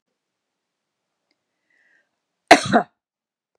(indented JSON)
{
  "cough_length": "3.6 s",
  "cough_amplitude": 32768,
  "cough_signal_mean_std_ratio": 0.17,
  "survey_phase": "beta (2021-08-13 to 2022-03-07)",
  "age": "45-64",
  "gender": "Female",
  "wearing_mask": "No",
  "symptom_none": true,
  "smoker_status": "Never smoked",
  "respiratory_condition_asthma": false,
  "respiratory_condition_other": false,
  "recruitment_source": "REACT",
  "submission_delay": "1 day",
  "covid_test_result": "Negative",
  "covid_test_method": "RT-qPCR",
  "influenza_a_test_result": "Negative",
  "influenza_b_test_result": "Negative"
}